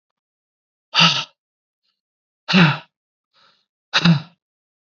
{
  "exhalation_length": "4.9 s",
  "exhalation_amplitude": 30362,
  "exhalation_signal_mean_std_ratio": 0.31,
  "survey_phase": "alpha (2021-03-01 to 2021-08-12)",
  "age": "18-44",
  "gender": "Male",
  "wearing_mask": "No",
  "symptom_cough_any": true,
  "symptom_fatigue": true,
  "symptom_headache": true,
  "symptom_onset": "3 days",
  "smoker_status": "Never smoked",
  "respiratory_condition_asthma": false,
  "respiratory_condition_other": false,
  "recruitment_source": "Test and Trace",
  "submission_delay": "1 day",
  "covid_test_result": "Positive",
  "covid_test_method": "RT-qPCR",
  "covid_ct_value": 18.7,
  "covid_ct_gene": "ORF1ab gene",
  "covid_ct_mean": 19.7,
  "covid_viral_load": "340000 copies/ml",
  "covid_viral_load_category": "Low viral load (10K-1M copies/ml)"
}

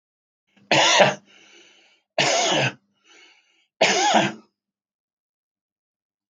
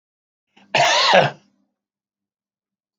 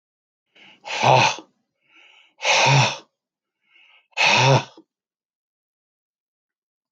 {
  "three_cough_length": "6.3 s",
  "three_cough_amplitude": 32766,
  "three_cough_signal_mean_std_ratio": 0.4,
  "cough_length": "3.0 s",
  "cough_amplitude": 32766,
  "cough_signal_mean_std_ratio": 0.35,
  "exhalation_length": "6.9 s",
  "exhalation_amplitude": 28734,
  "exhalation_signal_mean_std_ratio": 0.37,
  "survey_phase": "beta (2021-08-13 to 2022-03-07)",
  "age": "45-64",
  "gender": "Male",
  "wearing_mask": "No",
  "symptom_none": true,
  "smoker_status": "Current smoker (e-cigarettes or vapes only)",
  "respiratory_condition_asthma": false,
  "respiratory_condition_other": false,
  "recruitment_source": "REACT",
  "submission_delay": "0 days",
  "covid_test_result": "Negative",
  "covid_test_method": "RT-qPCR",
  "influenza_a_test_result": "Negative",
  "influenza_b_test_result": "Negative"
}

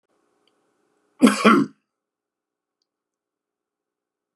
{
  "cough_length": "4.4 s",
  "cough_amplitude": 30737,
  "cough_signal_mean_std_ratio": 0.22,
  "survey_phase": "beta (2021-08-13 to 2022-03-07)",
  "age": "65+",
  "gender": "Male",
  "wearing_mask": "No",
  "symptom_cough_any": true,
  "symptom_runny_or_blocked_nose": true,
  "smoker_status": "Ex-smoker",
  "respiratory_condition_asthma": false,
  "respiratory_condition_other": false,
  "recruitment_source": "Test and Trace",
  "submission_delay": "0 days",
  "covid_test_result": "Positive",
  "covid_test_method": "LFT"
}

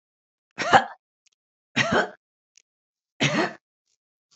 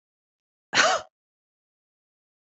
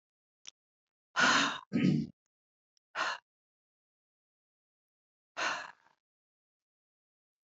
{
  "three_cough_length": "4.4 s",
  "three_cough_amplitude": 27040,
  "three_cough_signal_mean_std_ratio": 0.31,
  "cough_length": "2.5 s",
  "cough_amplitude": 19611,
  "cough_signal_mean_std_ratio": 0.25,
  "exhalation_length": "7.5 s",
  "exhalation_amplitude": 5946,
  "exhalation_signal_mean_std_ratio": 0.3,
  "survey_phase": "beta (2021-08-13 to 2022-03-07)",
  "age": "65+",
  "gender": "Female",
  "wearing_mask": "No",
  "symptom_cough_any": true,
  "symptom_new_continuous_cough": true,
  "symptom_sore_throat": true,
  "symptom_diarrhoea": true,
  "symptom_fatigue": true,
  "symptom_other": true,
  "symptom_onset": "6 days",
  "smoker_status": "Never smoked",
  "respiratory_condition_asthma": true,
  "respiratory_condition_other": false,
  "recruitment_source": "Test and Trace",
  "submission_delay": "2 days",
  "covid_test_result": "Negative",
  "covid_test_method": "ePCR"
}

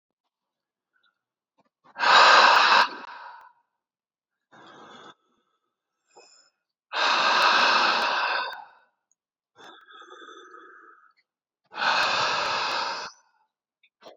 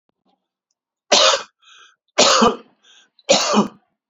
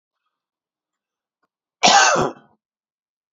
{
  "exhalation_length": "14.2 s",
  "exhalation_amplitude": 22663,
  "exhalation_signal_mean_std_ratio": 0.41,
  "three_cough_length": "4.1 s",
  "three_cough_amplitude": 32767,
  "three_cough_signal_mean_std_ratio": 0.41,
  "cough_length": "3.3 s",
  "cough_amplitude": 28444,
  "cough_signal_mean_std_ratio": 0.29,
  "survey_phase": "beta (2021-08-13 to 2022-03-07)",
  "age": "18-44",
  "gender": "Male",
  "wearing_mask": "No",
  "symptom_runny_or_blocked_nose": true,
  "symptom_shortness_of_breath": true,
  "symptom_sore_throat": true,
  "symptom_abdominal_pain": true,
  "symptom_diarrhoea": true,
  "symptom_fatigue": true,
  "symptom_headache": true,
  "smoker_status": "Ex-smoker",
  "respiratory_condition_asthma": false,
  "respiratory_condition_other": false,
  "recruitment_source": "Test and Trace",
  "submission_delay": "2 days",
  "covid_test_result": "Positive",
  "covid_test_method": "RT-qPCR",
  "covid_ct_value": 27.4,
  "covid_ct_gene": "ORF1ab gene",
  "covid_ct_mean": 27.7,
  "covid_viral_load": "830 copies/ml",
  "covid_viral_load_category": "Minimal viral load (< 10K copies/ml)"
}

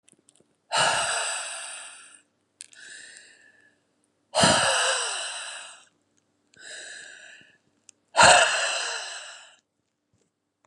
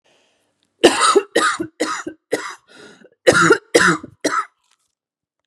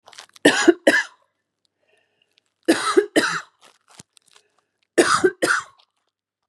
{
  "exhalation_length": "10.7 s",
  "exhalation_amplitude": 26728,
  "exhalation_signal_mean_std_ratio": 0.39,
  "cough_length": "5.5 s",
  "cough_amplitude": 32768,
  "cough_signal_mean_std_ratio": 0.42,
  "three_cough_length": "6.5 s",
  "three_cough_amplitude": 31559,
  "three_cough_signal_mean_std_ratio": 0.35,
  "survey_phase": "beta (2021-08-13 to 2022-03-07)",
  "age": "18-44",
  "gender": "Female",
  "wearing_mask": "No",
  "symptom_cough_any": true,
  "symptom_runny_or_blocked_nose": true,
  "symptom_shortness_of_breath": true,
  "symptom_change_to_sense_of_smell_or_taste": true,
  "smoker_status": "Ex-smoker",
  "respiratory_condition_asthma": true,
  "respiratory_condition_other": false,
  "recruitment_source": "Test and Trace",
  "submission_delay": "2 days",
  "covid_test_result": "Positive",
  "covid_test_method": "RT-qPCR",
  "covid_ct_value": 17.4,
  "covid_ct_gene": "ORF1ab gene",
  "covid_ct_mean": 17.8,
  "covid_viral_load": "1400000 copies/ml",
  "covid_viral_load_category": "High viral load (>1M copies/ml)"
}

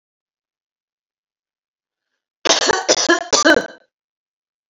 {
  "cough_length": "4.7 s",
  "cough_amplitude": 32768,
  "cough_signal_mean_std_ratio": 0.34,
  "survey_phase": "alpha (2021-03-01 to 2021-08-12)",
  "age": "45-64",
  "gender": "Female",
  "wearing_mask": "No",
  "symptom_none": true,
  "smoker_status": "Ex-smoker",
  "respiratory_condition_asthma": false,
  "respiratory_condition_other": false,
  "recruitment_source": "REACT",
  "submission_delay": "2 days",
  "covid_test_result": "Negative",
  "covid_test_method": "RT-qPCR"
}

